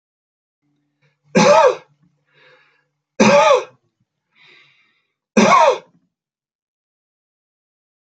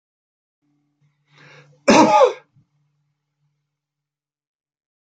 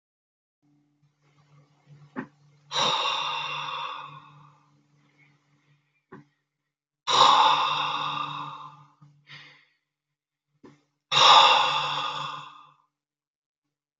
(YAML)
three_cough_length: 8.0 s
three_cough_amplitude: 32722
three_cough_signal_mean_std_ratio: 0.33
cough_length: 5.0 s
cough_amplitude: 28426
cough_signal_mean_std_ratio: 0.24
exhalation_length: 14.0 s
exhalation_amplitude: 23667
exhalation_signal_mean_std_ratio: 0.37
survey_phase: alpha (2021-03-01 to 2021-08-12)
age: 65+
gender: Male
wearing_mask: 'No'
symptom_none: true
smoker_status: Never smoked
respiratory_condition_asthma: false
respiratory_condition_other: false
recruitment_source: REACT
submission_delay: 1 day
covid_test_result: Negative
covid_test_method: RT-qPCR